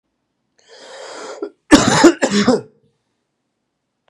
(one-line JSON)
{"cough_length": "4.1 s", "cough_amplitude": 32768, "cough_signal_mean_std_ratio": 0.35, "survey_phase": "beta (2021-08-13 to 2022-03-07)", "age": "18-44", "gender": "Male", "wearing_mask": "No", "symptom_cough_any": true, "symptom_new_continuous_cough": true, "symptom_runny_or_blocked_nose": true, "symptom_sore_throat": true, "symptom_fatigue": true, "symptom_headache": true, "symptom_onset": "2 days", "smoker_status": "Never smoked", "respiratory_condition_asthma": false, "respiratory_condition_other": false, "recruitment_source": "Test and Trace", "submission_delay": "1 day", "covid_test_result": "Negative", "covid_test_method": "RT-qPCR"}